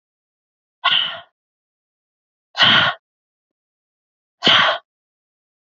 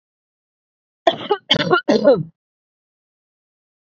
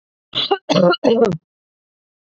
{
  "exhalation_length": "5.6 s",
  "exhalation_amplitude": 32401,
  "exhalation_signal_mean_std_ratio": 0.33,
  "three_cough_length": "3.8 s",
  "three_cough_amplitude": 31770,
  "three_cough_signal_mean_std_ratio": 0.34,
  "cough_length": "2.3 s",
  "cough_amplitude": 27552,
  "cough_signal_mean_std_ratio": 0.47,
  "survey_phase": "beta (2021-08-13 to 2022-03-07)",
  "age": "45-64",
  "gender": "Female",
  "wearing_mask": "No",
  "symptom_none": true,
  "smoker_status": "Never smoked",
  "respiratory_condition_asthma": false,
  "respiratory_condition_other": false,
  "recruitment_source": "REACT",
  "submission_delay": "1 day",
  "covid_test_result": "Negative",
  "covid_test_method": "RT-qPCR",
  "influenza_a_test_result": "Unknown/Void",
  "influenza_b_test_result": "Unknown/Void"
}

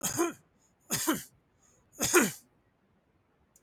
{
  "three_cough_length": "3.6 s",
  "three_cough_amplitude": 11074,
  "three_cough_signal_mean_std_ratio": 0.38,
  "survey_phase": "beta (2021-08-13 to 2022-03-07)",
  "age": "45-64",
  "gender": "Male",
  "wearing_mask": "No",
  "symptom_none": true,
  "smoker_status": "Never smoked",
  "respiratory_condition_asthma": false,
  "respiratory_condition_other": false,
  "recruitment_source": "REACT",
  "submission_delay": "1 day",
  "covid_test_result": "Negative",
  "covid_test_method": "RT-qPCR",
  "influenza_a_test_result": "Negative",
  "influenza_b_test_result": "Negative"
}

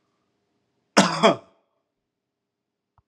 {
  "cough_length": "3.1 s",
  "cough_amplitude": 32398,
  "cough_signal_mean_std_ratio": 0.23,
  "survey_phase": "alpha (2021-03-01 to 2021-08-12)",
  "age": "45-64",
  "gender": "Male",
  "wearing_mask": "No",
  "symptom_none": true,
  "smoker_status": "Ex-smoker",
  "respiratory_condition_asthma": false,
  "respiratory_condition_other": false,
  "recruitment_source": "REACT",
  "submission_delay": "2 days",
  "covid_test_result": "Negative",
  "covid_test_method": "RT-qPCR"
}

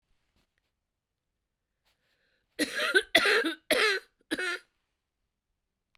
{
  "three_cough_length": "6.0 s",
  "three_cough_amplitude": 15321,
  "three_cough_signal_mean_std_ratio": 0.35,
  "survey_phase": "beta (2021-08-13 to 2022-03-07)",
  "age": "45-64",
  "gender": "Female",
  "wearing_mask": "No",
  "symptom_cough_any": true,
  "symptom_runny_or_blocked_nose": true,
  "symptom_fatigue": true,
  "symptom_other": true,
  "smoker_status": "Ex-smoker",
  "respiratory_condition_asthma": true,
  "respiratory_condition_other": false,
  "recruitment_source": "Test and Trace",
  "submission_delay": "1 day",
  "covid_test_result": "Positive",
  "covid_test_method": "LFT"
}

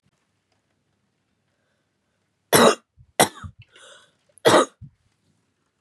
{
  "three_cough_length": "5.8 s",
  "three_cough_amplitude": 31388,
  "three_cough_signal_mean_std_ratio": 0.24,
  "survey_phase": "beta (2021-08-13 to 2022-03-07)",
  "age": "18-44",
  "gender": "Female",
  "wearing_mask": "No",
  "symptom_fatigue": true,
  "smoker_status": "Never smoked",
  "respiratory_condition_asthma": false,
  "respiratory_condition_other": false,
  "recruitment_source": "REACT",
  "submission_delay": "2 days",
  "covid_test_result": "Negative",
  "covid_test_method": "RT-qPCR",
  "influenza_a_test_result": "Negative",
  "influenza_b_test_result": "Negative"
}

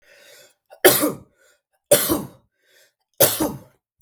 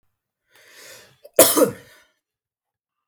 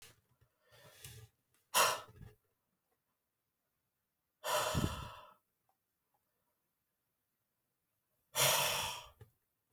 {
  "three_cough_length": "4.0 s",
  "three_cough_amplitude": 32768,
  "three_cough_signal_mean_std_ratio": 0.34,
  "cough_length": "3.1 s",
  "cough_amplitude": 32768,
  "cough_signal_mean_std_ratio": 0.24,
  "exhalation_length": "9.7 s",
  "exhalation_amplitude": 4912,
  "exhalation_signal_mean_std_ratio": 0.31,
  "survey_phase": "beta (2021-08-13 to 2022-03-07)",
  "age": "18-44",
  "gender": "Male",
  "wearing_mask": "No",
  "symptom_headache": true,
  "symptom_onset": "3 days",
  "smoker_status": "Current smoker (e-cigarettes or vapes only)",
  "respiratory_condition_asthma": false,
  "respiratory_condition_other": false,
  "recruitment_source": "REACT",
  "submission_delay": "1 day",
  "covid_test_result": "Negative",
  "covid_test_method": "RT-qPCR",
  "influenza_a_test_result": "Negative",
  "influenza_b_test_result": "Negative"
}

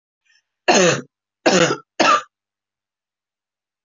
{
  "three_cough_length": "3.8 s",
  "three_cough_amplitude": 27881,
  "three_cough_signal_mean_std_ratio": 0.37,
  "survey_phase": "beta (2021-08-13 to 2022-03-07)",
  "age": "45-64",
  "gender": "Female",
  "wearing_mask": "No",
  "symptom_headache": true,
  "symptom_change_to_sense_of_smell_or_taste": true,
  "symptom_loss_of_taste": true,
  "smoker_status": "Ex-smoker",
  "respiratory_condition_asthma": false,
  "respiratory_condition_other": false,
  "recruitment_source": "REACT",
  "submission_delay": "1 day",
  "covid_test_result": "Negative",
  "covid_test_method": "RT-qPCR"
}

